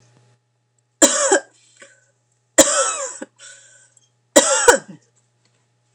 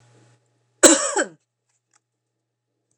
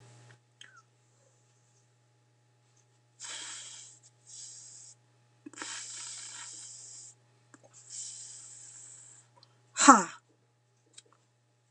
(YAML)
three_cough_length: 5.9 s
three_cough_amplitude: 29204
three_cough_signal_mean_std_ratio: 0.33
cough_length: 3.0 s
cough_amplitude: 29204
cough_signal_mean_std_ratio: 0.24
exhalation_length: 11.7 s
exhalation_amplitude: 28224
exhalation_signal_mean_std_ratio: 0.19
survey_phase: beta (2021-08-13 to 2022-03-07)
age: 45-64
gender: Female
wearing_mask: 'No'
symptom_none: true
smoker_status: Never smoked
respiratory_condition_asthma: false
respiratory_condition_other: false
recruitment_source: REACT
submission_delay: 2 days
covid_test_result: Negative
covid_test_method: RT-qPCR
influenza_a_test_result: Negative
influenza_b_test_result: Negative